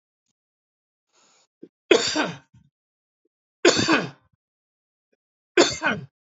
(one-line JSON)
{"three_cough_length": "6.3 s", "three_cough_amplitude": 28012, "three_cough_signal_mean_std_ratio": 0.3, "survey_phase": "beta (2021-08-13 to 2022-03-07)", "age": "45-64", "gender": "Male", "wearing_mask": "No", "symptom_none": true, "smoker_status": "Ex-smoker", "respiratory_condition_asthma": false, "respiratory_condition_other": false, "recruitment_source": "REACT", "submission_delay": "1 day", "covid_test_result": "Negative", "covid_test_method": "RT-qPCR", "influenza_a_test_result": "Negative", "influenza_b_test_result": "Negative"}